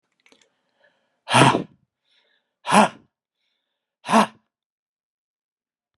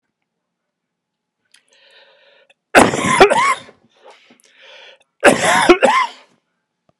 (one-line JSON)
{"exhalation_length": "6.0 s", "exhalation_amplitude": 32325, "exhalation_signal_mean_std_ratio": 0.26, "cough_length": "7.0 s", "cough_amplitude": 32768, "cough_signal_mean_std_ratio": 0.36, "survey_phase": "beta (2021-08-13 to 2022-03-07)", "age": "65+", "gender": "Male", "wearing_mask": "No", "symptom_cough_any": true, "symptom_runny_or_blocked_nose": true, "symptom_sore_throat": true, "symptom_headache": true, "symptom_onset": "3 days", "smoker_status": "Never smoked", "respiratory_condition_asthma": false, "respiratory_condition_other": false, "recruitment_source": "Test and Trace", "submission_delay": "2 days", "covid_test_result": "Positive", "covid_test_method": "RT-qPCR", "covid_ct_value": 17.0, "covid_ct_gene": "ORF1ab gene", "covid_ct_mean": 18.3, "covid_viral_load": "960000 copies/ml", "covid_viral_load_category": "Low viral load (10K-1M copies/ml)"}